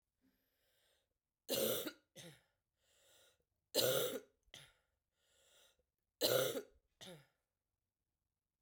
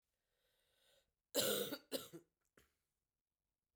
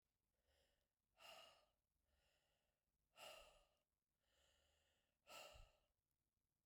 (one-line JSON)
{"three_cough_length": "8.6 s", "three_cough_amplitude": 3299, "three_cough_signal_mean_std_ratio": 0.32, "cough_length": "3.8 s", "cough_amplitude": 2036, "cough_signal_mean_std_ratio": 0.3, "exhalation_length": "6.7 s", "exhalation_amplitude": 124, "exhalation_signal_mean_std_ratio": 0.4, "survey_phase": "beta (2021-08-13 to 2022-03-07)", "age": "45-64", "gender": "Female", "wearing_mask": "No", "symptom_cough_any": true, "symptom_runny_or_blocked_nose": true, "symptom_sore_throat": true, "symptom_headache": true, "symptom_change_to_sense_of_smell_or_taste": true, "smoker_status": "Never smoked", "respiratory_condition_asthma": false, "respiratory_condition_other": false, "recruitment_source": "Test and Trace", "submission_delay": "1 day", "covid_test_result": "Positive", "covid_test_method": "LFT"}